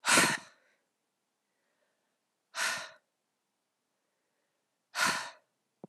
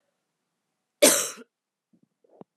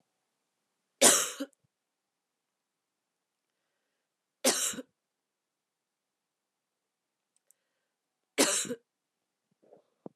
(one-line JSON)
{"exhalation_length": "5.9 s", "exhalation_amplitude": 9973, "exhalation_signal_mean_std_ratio": 0.29, "cough_length": "2.6 s", "cough_amplitude": 27386, "cough_signal_mean_std_ratio": 0.23, "three_cough_length": "10.2 s", "three_cough_amplitude": 15242, "three_cough_signal_mean_std_ratio": 0.21, "survey_phase": "beta (2021-08-13 to 2022-03-07)", "age": "45-64", "gender": "Female", "wearing_mask": "No", "symptom_runny_or_blocked_nose": true, "symptom_sore_throat": true, "symptom_abdominal_pain": true, "symptom_fatigue": true, "symptom_headache": true, "symptom_onset": "2 days", "smoker_status": "Never smoked", "respiratory_condition_asthma": false, "respiratory_condition_other": false, "recruitment_source": "Test and Trace", "submission_delay": "1 day", "covid_test_result": "Positive", "covid_test_method": "RT-qPCR"}